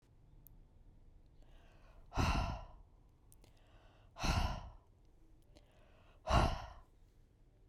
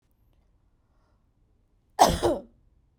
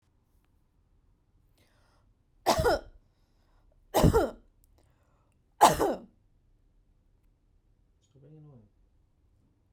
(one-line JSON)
{"exhalation_length": "7.7 s", "exhalation_amplitude": 4495, "exhalation_signal_mean_std_ratio": 0.38, "cough_length": "3.0 s", "cough_amplitude": 20097, "cough_signal_mean_std_ratio": 0.25, "three_cough_length": "9.7 s", "three_cough_amplitude": 19610, "three_cough_signal_mean_std_ratio": 0.25, "survey_phase": "beta (2021-08-13 to 2022-03-07)", "age": "18-44", "gender": "Female", "wearing_mask": "No", "symptom_none": true, "smoker_status": "Never smoked", "respiratory_condition_asthma": false, "respiratory_condition_other": false, "recruitment_source": "REACT", "submission_delay": "1 day", "covid_test_result": "Negative", "covid_test_method": "RT-qPCR"}